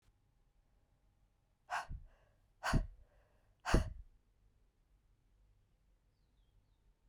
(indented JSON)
{
  "exhalation_length": "7.1 s",
  "exhalation_amplitude": 4712,
  "exhalation_signal_mean_std_ratio": 0.24,
  "survey_phase": "beta (2021-08-13 to 2022-03-07)",
  "age": "45-64",
  "gender": "Female",
  "wearing_mask": "No",
  "symptom_cough_any": true,
  "symptom_new_continuous_cough": true,
  "symptom_runny_or_blocked_nose": true,
  "symptom_sore_throat": true,
  "symptom_fatigue": true,
  "symptom_fever_high_temperature": true,
  "symptom_headache": true,
  "symptom_change_to_sense_of_smell_or_taste": true,
  "symptom_loss_of_taste": true,
  "symptom_onset": "3 days",
  "smoker_status": "Never smoked",
  "respiratory_condition_asthma": false,
  "respiratory_condition_other": false,
  "recruitment_source": "Test and Trace",
  "submission_delay": "1 day",
  "covid_test_result": "Positive",
  "covid_test_method": "RT-qPCR",
  "covid_ct_value": 24.0,
  "covid_ct_gene": "ORF1ab gene",
  "covid_ct_mean": 24.4,
  "covid_viral_load": "9800 copies/ml",
  "covid_viral_load_category": "Minimal viral load (< 10K copies/ml)"
}